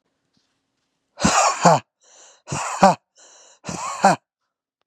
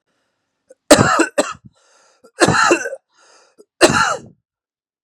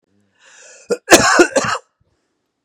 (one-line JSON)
{"exhalation_length": "4.9 s", "exhalation_amplitude": 32768, "exhalation_signal_mean_std_ratio": 0.36, "three_cough_length": "5.0 s", "three_cough_amplitude": 32768, "three_cough_signal_mean_std_ratio": 0.38, "cough_length": "2.6 s", "cough_amplitude": 32768, "cough_signal_mean_std_ratio": 0.37, "survey_phase": "beta (2021-08-13 to 2022-03-07)", "age": "18-44", "gender": "Male", "wearing_mask": "No", "symptom_none": true, "smoker_status": "Ex-smoker", "respiratory_condition_asthma": false, "respiratory_condition_other": false, "recruitment_source": "REACT", "submission_delay": "1 day", "covid_test_result": "Negative", "covid_test_method": "RT-qPCR", "influenza_a_test_result": "Negative", "influenza_b_test_result": "Negative"}